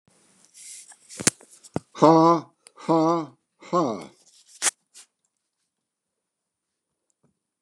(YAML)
exhalation_length: 7.6 s
exhalation_amplitude: 29203
exhalation_signal_mean_std_ratio: 0.3
survey_phase: beta (2021-08-13 to 2022-03-07)
age: 65+
gender: Male
wearing_mask: 'No'
symptom_none: true
smoker_status: Ex-smoker
respiratory_condition_asthma: false
respiratory_condition_other: false
recruitment_source: REACT
submission_delay: 4 days
covid_test_result: Negative
covid_test_method: RT-qPCR
influenza_a_test_result: Negative
influenza_b_test_result: Negative